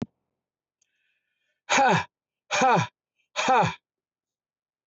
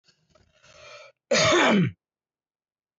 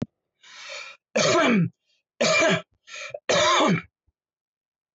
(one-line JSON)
{"exhalation_length": "4.9 s", "exhalation_amplitude": 12282, "exhalation_signal_mean_std_ratio": 0.39, "cough_length": "3.0 s", "cough_amplitude": 13078, "cough_signal_mean_std_ratio": 0.4, "three_cough_length": "4.9 s", "three_cough_amplitude": 12611, "three_cough_signal_mean_std_ratio": 0.52, "survey_phase": "beta (2021-08-13 to 2022-03-07)", "age": "45-64", "gender": "Male", "wearing_mask": "No", "symptom_none": true, "smoker_status": "Never smoked", "respiratory_condition_asthma": false, "respiratory_condition_other": false, "recruitment_source": "REACT", "submission_delay": "2 days", "covid_test_result": "Negative", "covid_test_method": "RT-qPCR"}